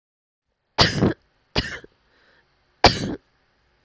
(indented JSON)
{
  "three_cough_length": "3.8 s",
  "three_cough_amplitude": 30149,
  "three_cough_signal_mean_std_ratio": 0.3,
  "survey_phase": "alpha (2021-03-01 to 2021-08-12)",
  "age": "18-44",
  "gender": "Female",
  "wearing_mask": "No",
  "symptom_cough_any": true,
  "symptom_new_continuous_cough": true,
  "symptom_fever_high_temperature": true,
  "symptom_headache": true,
  "symptom_change_to_sense_of_smell_or_taste": true,
  "symptom_loss_of_taste": true,
  "symptom_onset": "3 days",
  "smoker_status": "Never smoked",
  "respiratory_condition_asthma": false,
  "respiratory_condition_other": false,
  "recruitment_source": "Test and Trace",
  "submission_delay": "2 days",
  "covid_test_result": "Positive",
  "covid_test_method": "RT-qPCR",
  "covid_ct_value": 15.3,
  "covid_ct_gene": "N gene",
  "covid_ct_mean": 16.6,
  "covid_viral_load": "3500000 copies/ml",
  "covid_viral_load_category": "High viral load (>1M copies/ml)"
}